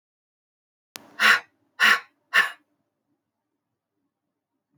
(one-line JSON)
{"exhalation_length": "4.8 s", "exhalation_amplitude": 21735, "exhalation_signal_mean_std_ratio": 0.26, "survey_phase": "beta (2021-08-13 to 2022-03-07)", "age": "45-64", "gender": "Female", "wearing_mask": "No", "symptom_cough_any": true, "symptom_shortness_of_breath": true, "symptom_sore_throat": true, "symptom_diarrhoea": true, "symptom_fatigue": true, "symptom_headache": true, "symptom_onset": "1 day", "smoker_status": "Never smoked", "respiratory_condition_asthma": false, "respiratory_condition_other": true, "recruitment_source": "Test and Trace", "submission_delay": "1 day", "covid_test_result": "Positive", "covid_test_method": "RT-qPCR", "covid_ct_value": 23.6, "covid_ct_gene": "N gene"}